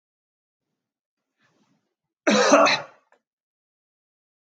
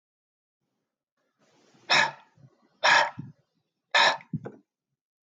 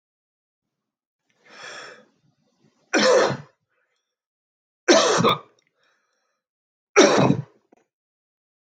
{"cough_length": "4.5 s", "cough_amplitude": 26061, "cough_signal_mean_std_ratio": 0.27, "exhalation_length": "5.3 s", "exhalation_amplitude": 14404, "exhalation_signal_mean_std_ratio": 0.3, "three_cough_length": "8.8 s", "three_cough_amplitude": 25442, "three_cough_signal_mean_std_ratio": 0.32, "survey_phase": "beta (2021-08-13 to 2022-03-07)", "age": "45-64", "gender": "Male", "wearing_mask": "No", "symptom_none": true, "smoker_status": "Never smoked", "respiratory_condition_asthma": false, "respiratory_condition_other": false, "recruitment_source": "REACT", "submission_delay": "5 days", "covid_test_result": "Negative", "covid_test_method": "RT-qPCR"}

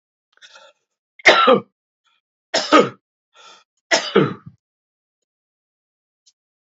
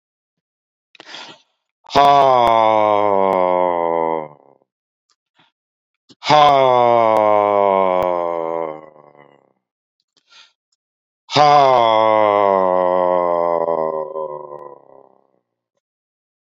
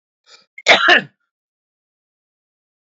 {"three_cough_length": "6.7 s", "three_cough_amplitude": 29660, "three_cough_signal_mean_std_ratio": 0.28, "exhalation_length": "16.5 s", "exhalation_amplitude": 28999, "exhalation_signal_mean_std_ratio": 0.49, "cough_length": "2.9 s", "cough_amplitude": 29969, "cough_signal_mean_std_ratio": 0.26, "survey_phase": "beta (2021-08-13 to 2022-03-07)", "age": "45-64", "gender": "Male", "wearing_mask": "No", "symptom_cough_any": true, "symptom_sore_throat": true, "symptom_fatigue": true, "symptom_headache": true, "smoker_status": "Never smoked", "respiratory_condition_asthma": false, "respiratory_condition_other": false, "recruitment_source": "Test and Trace", "submission_delay": "2 days", "covid_test_result": "Positive", "covid_test_method": "LFT"}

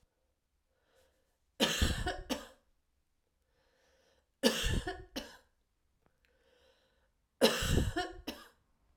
{"three_cough_length": "9.0 s", "three_cough_amplitude": 10254, "three_cough_signal_mean_std_ratio": 0.35, "survey_phase": "alpha (2021-03-01 to 2021-08-12)", "age": "45-64", "gender": "Female", "wearing_mask": "No", "symptom_none": true, "smoker_status": "Ex-smoker", "respiratory_condition_asthma": true, "respiratory_condition_other": false, "recruitment_source": "REACT", "submission_delay": "3 days", "covid_test_result": "Negative", "covid_test_method": "RT-qPCR"}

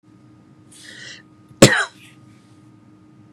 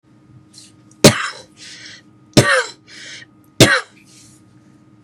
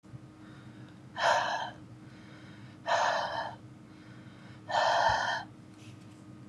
{"cough_length": "3.3 s", "cough_amplitude": 32768, "cough_signal_mean_std_ratio": 0.22, "three_cough_length": "5.0 s", "three_cough_amplitude": 32768, "three_cough_signal_mean_std_ratio": 0.3, "exhalation_length": "6.5 s", "exhalation_amplitude": 6251, "exhalation_signal_mean_std_ratio": 0.55, "survey_phase": "beta (2021-08-13 to 2022-03-07)", "age": "18-44", "gender": "Male", "wearing_mask": "No", "symptom_none": true, "smoker_status": "Never smoked", "respiratory_condition_asthma": false, "respiratory_condition_other": false, "recruitment_source": "REACT", "submission_delay": "1 day", "covid_test_result": "Negative", "covid_test_method": "RT-qPCR", "influenza_a_test_result": "Negative", "influenza_b_test_result": "Negative"}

